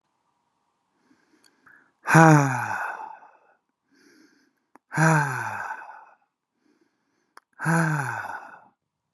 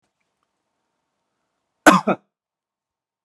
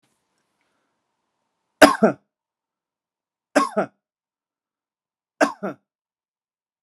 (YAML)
exhalation_length: 9.1 s
exhalation_amplitude: 32243
exhalation_signal_mean_std_ratio: 0.33
cough_length: 3.2 s
cough_amplitude: 32768
cough_signal_mean_std_ratio: 0.18
three_cough_length: 6.8 s
three_cough_amplitude: 32768
three_cough_signal_mean_std_ratio: 0.19
survey_phase: beta (2021-08-13 to 2022-03-07)
age: 18-44
gender: Male
wearing_mask: 'No'
symptom_none: true
smoker_status: Current smoker (e-cigarettes or vapes only)
respiratory_condition_asthma: false
respiratory_condition_other: false
recruitment_source: REACT
submission_delay: 1 day
covid_test_result: Negative
covid_test_method: RT-qPCR